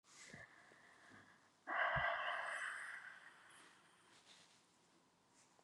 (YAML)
exhalation_length: 5.6 s
exhalation_amplitude: 1420
exhalation_signal_mean_std_ratio: 0.47
survey_phase: beta (2021-08-13 to 2022-03-07)
age: 45-64
gender: Female
wearing_mask: 'No'
symptom_none: true
smoker_status: Never smoked
respiratory_condition_asthma: false
respiratory_condition_other: false
recruitment_source: REACT
submission_delay: 6 days
covid_test_result: Negative
covid_test_method: RT-qPCR
influenza_a_test_result: Negative
influenza_b_test_result: Negative